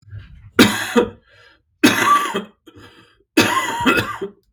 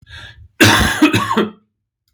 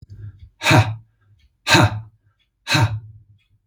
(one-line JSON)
{"three_cough_length": "4.5 s", "three_cough_amplitude": 32768, "three_cough_signal_mean_std_ratio": 0.5, "cough_length": "2.1 s", "cough_amplitude": 32768, "cough_signal_mean_std_ratio": 0.53, "exhalation_length": "3.7 s", "exhalation_amplitude": 32766, "exhalation_signal_mean_std_ratio": 0.41, "survey_phase": "beta (2021-08-13 to 2022-03-07)", "age": "45-64", "gender": "Male", "wearing_mask": "No", "symptom_cough_any": true, "symptom_new_continuous_cough": true, "symptom_runny_or_blocked_nose": true, "symptom_sore_throat": true, "symptom_fatigue": true, "symptom_change_to_sense_of_smell_or_taste": true, "symptom_onset": "5 days", "smoker_status": "Ex-smoker", "respiratory_condition_asthma": false, "respiratory_condition_other": false, "recruitment_source": "REACT", "submission_delay": "2 days", "covid_test_result": "Positive", "covid_test_method": "RT-qPCR", "covid_ct_value": 27.0, "covid_ct_gene": "E gene", "influenza_a_test_result": "Negative", "influenza_b_test_result": "Negative"}